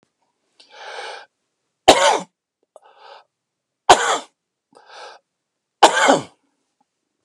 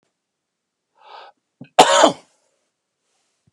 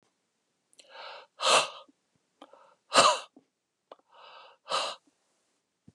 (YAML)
three_cough_length: 7.2 s
three_cough_amplitude: 32768
three_cough_signal_mean_std_ratio: 0.27
cough_length: 3.5 s
cough_amplitude: 32768
cough_signal_mean_std_ratio: 0.23
exhalation_length: 5.9 s
exhalation_amplitude: 15802
exhalation_signal_mean_std_ratio: 0.28
survey_phase: beta (2021-08-13 to 2022-03-07)
age: 45-64
gender: Male
wearing_mask: 'No'
symptom_none: true
smoker_status: Never smoked
respiratory_condition_asthma: false
respiratory_condition_other: false
recruitment_source: REACT
submission_delay: 0 days
covid_test_result: Negative
covid_test_method: RT-qPCR
influenza_a_test_result: Negative
influenza_b_test_result: Negative